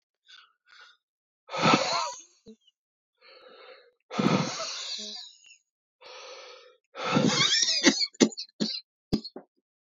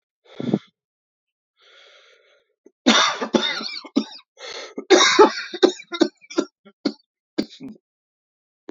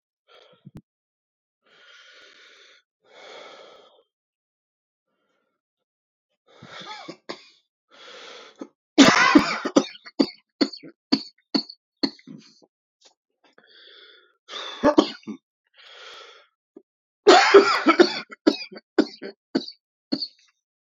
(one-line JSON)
{"exhalation_length": "9.8 s", "exhalation_amplitude": 18938, "exhalation_signal_mean_std_ratio": 0.42, "cough_length": "8.7 s", "cough_amplitude": 30057, "cough_signal_mean_std_ratio": 0.34, "three_cough_length": "20.8 s", "three_cough_amplitude": 29678, "three_cough_signal_mean_std_ratio": 0.26, "survey_phase": "beta (2021-08-13 to 2022-03-07)", "age": "45-64", "gender": "Male", "wearing_mask": "No", "symptom_cough_any": true, "symptom_runny_or_blocked_nose": true, "symptom_shortness_of_breath": true, "symptom_sore_throat": true, "symptom_abdominal_pain": true, "symptom_fatigue": true, "symptom_fever_high_temperature": true, "symptom_headache": true, "symptom_change_to_sense_of_smell_or_taste": true, "symptom_loss_of_taste": true, "symptom_other": true, "symptom_onset": "3 days", "smoker_status": "Never smoked", "respiratory_condition_asthma": false, "respiratory_condition_other": false, "recruitment_source": "Test and Trace", "submission_delay": "2 days", "covid_test_result": "Positive", "covid_test_method": "LAMP"}